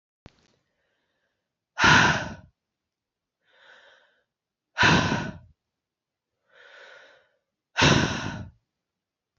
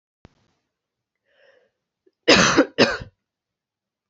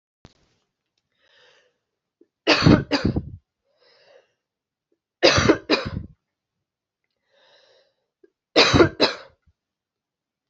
exhalation_length: 9.4 s
exhalation_amplitude: 21718
exhalation_signal_mean_std_ratio: 0.31
cough_length: 4.1 s
cough_amplitude: 28264
cough_signal_mean_std_ratio: 0.28
three_cough_length: 10.5 s
three_cough_amplitude: 28659
three_cough_signal_mean_std_ratio: 0.29
survey_phase: beta (2021-08-13 to 2022-03-07)
age: 18-44
gender: Female
wearing_mask: 'No'
symptom_cough_any: true
symptom_runny_or_blocked_nose: true
symptom_shortness_of_breath: true
symptom_sore_throat: true
symptom_abdominal_pain: true
symptom_fatigue: true
symptom_headache: true
symptom_change_to_sense_of_smell_or_taste: true
symptom_other: true
symptom_onset: 4 days
smoker_status: Never smoked
respiratory_condition_asthma: true
respiratory_condition_other: false
recruitment_source: Test and Trace
submission_delay: 2 days
covid_test_result: Positive
covid_test_method: RT-qPCR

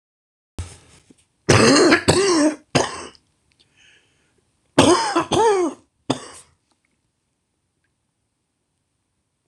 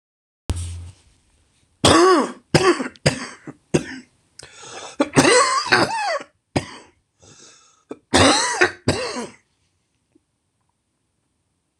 cough_length: 9.5 s
cough_amplitude: 26028
cough_signal_mean_std_ratio: 0.39
three_cough_length: 11.8 s
three_cough_amplitude: 26028
three_cough_signal_mean_std_ratio: 0.41
survey_phase: beta (2021-08-13 to 2022-03-07)
age: 45-64
gender: Male
wearing_mask: 'No'
symptom_cough_any: true
symptom_runny_or_blocked_nose: true
symptom_shortness_of_breath: true
symptom_sore_throat: true
symptom_fatigue: true
symptom_headache: true
symptom_onset: 6 days
smoker_status: Never smoked
respiratory_condition_asthma: false
respiratory_condition_other: false
recruitment_source: Test and Trace
submission_delay: 2 days
covid_test_result: Positive
covid_test_method: RT-qPCR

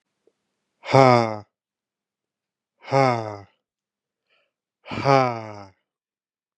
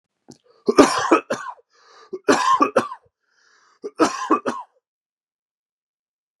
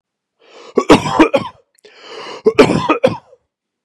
exhalation_length: 6.6 s
exhalation_amplitude: 32684
exhalation_signal_mean_std_ratio: 0.28
three_cough_length: 6.4 s
three_cough_amplitude: 32768
three_cough_signal_mean_std_ratio: 0.36
cough_length: 3.8 s
cough_amplitude: 32768
cough_signal_mean_std_ratio: 0.4
survey_phase: beta (2021-08-13 to 2022-03-07)
age: 18-44
gender: Male
wearing_mask: 'No'
symptom_none: true
smoker_status: Ex-smoker
respiratory_condition_asthma: false
respiratory_condition_other: false
recruitment_source: REACT
submission_delay: 4 days
covid_test_result: Negative
covid_test_method: RT-qPCR
influenza_a_test_result: Negative
influenza_b_test_result: Negative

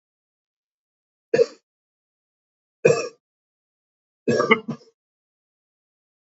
three_cough_length: 6.2 s
three_cough_amplitude: 28058
three_cough_signal_mean_std_ratio: 0.23
survey_phase: alpha (2021-03-01 to 2021-08-12)
age: 45-64
gender: Male
wearing_mask: 'No'
symptom_cough_any: true
symptom_new_continuous_cough: true
symptom_diarrhoea: true
symptom_fatigue: true
symptom_fever_high_temperature: true
symptom_headache: true
symptom_onset: 2 days
smoker_status: Ex-smoker
respiratory_condition_asthma: false
respiratory_condition_other: false
recruitment_source: Test and Trace
submission_delay: 2 days
covid_test_result: Positive
covid_test_method: RT-qPCR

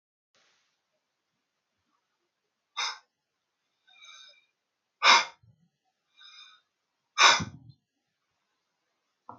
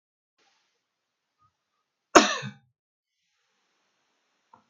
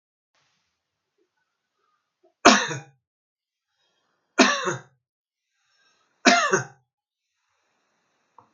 exhalation_length: 9.4 s
exhalation_amplitude: 18297
exhalation_signal_mean_std_ratio: 0.19
cough_length: 4.7 s
cough_amplitude: 32767
cough_signal_mean_std_ratio: 0.14
three_cough_length: 8.5 s
three_cough_amplitude: 32767
three_cough_signal_mean_std_ratio: 0.23
survey_phase: beta (2021-08-13 to 2022-03-07)
age: 65+
gender: Male
wearing_mask: 'No'
symptom_none: true
smoker_status: Ex-smoker
respiratory_condition_asthma: true
respiratory_condition_other: false
recruitment_source: REACT
submission_delay: 5 days
covid_test_result: Negative
covid_test_method: RT-qPCR
influenza_a_test_result: Negative
influenza_b_test_result: Negative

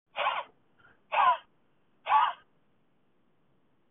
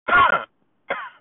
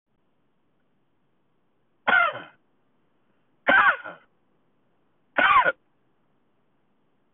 exhalation_length: 3.9 s
exhalation_amplitude: 7068
exhalation_signal_mean_std_ratio: 0.35
cough_length: 1.2 s
cough_amplitude: 17158
cough_signal_mean_std_ratio: 0.49
three_cough_length: 7.3 s
three_cough_amplitude: 16511
three_cough_signal_mean_std_ratio: 0.29
survey_phase: beta (2021-08-13 to 2022-03-07)
age: 45-64
gender: Male
wearing_mask: 'No'
symptom_none: true
smoker_status: Never smoked
respiratory_condition_asthma: false
respiratory_condition_other: false
recruitment_source: REACT
submission_delay: 3 days
covid_test_result: Negative
covid_test_method: RT-qPCR
influenza_a_test_result: Negative
influenza_b_test_result: Negative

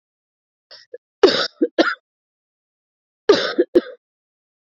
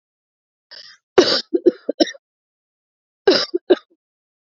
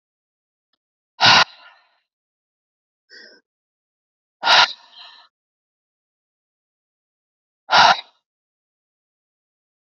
three_cough_length: 4.8 s
three_cough_amplitude: 27300
three_cough_signal_mean_std_ratio: 0.29
cough_length: 4.4 s
cough_amplitude: 28174
cough_signal_mean_std_ratio: 0.29
exhalation_length: 10.0 s
exhalation_amplitude: 32768
exhalation_signal_mean_std_ratio: 0.22
survey_phase: beta (2021-08-13 to 2022-03-07)
age: 45-64
gender: Female
wearing_mask: 'Yes'
symptom_cough_any: true
symptom_runny_or_blocked_nose: true
symptom_sore_throat: true
symptom_fatigue: true
symptom_fever_high_temperature: true
symptom_headache: true
symptom_change_to_sense_of_smell_or_taste: true
symptom_loss_of_taste: true
symptom_other: true
symptom_onset: 3 days
smoker_status: Never smoked
respiratory_condition_asthma: false
respiratory_condition_other: false
recruitment_source: Test and Trace
submission_delay: 2 days
covid_test_result: Positive
covid_test_method: ePCR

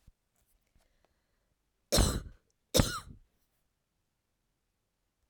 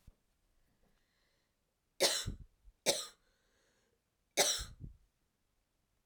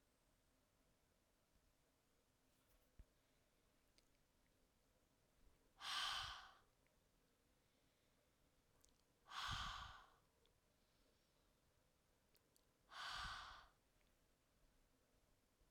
cough_length: 5.3 s
cough_amplitude: 10677
cough_signal_mean_std_ratio: 0.23
three_cough_length: 6.1 s
three_cough_amplitude: 5512
three_cough_signal_mean_std_ratio: 0.28
exhalation_length: 15.7 s
exhalation_amplitude: 606
exhalation_signal_mean_std_ratio: 0.34
survey_phase: beta (2021-08-13 to 2022-03-07)
age: 45-64
gender: Female
wearing_mask: 'No'
symptom_cough_any: true
symptom_runny_or_blocked_nose: true
symptom_fatigue: true
symptom_fever_high_temperature: true
symptom_change_to_sense_of_smell_or_taste: true
symptom_loss_of_taste: true
symptom_onset: 4 days
smoker_status: Never smoked
respiratory_condition_asthma: false
respiratory_condition_other: false
recruitment_source: Test and Trace
submission_delay: 3 days
covid_test_result: Positive
covid_test_method: RT-qPCR
covid_ct_value: 17.4
covid_ct_gene: ORF1ab gene
covid_ct_mean: 17.9
covid_viral_load: 1300000 copies/ml
covid_viral_load_category: High viral load (>1M copies/ml)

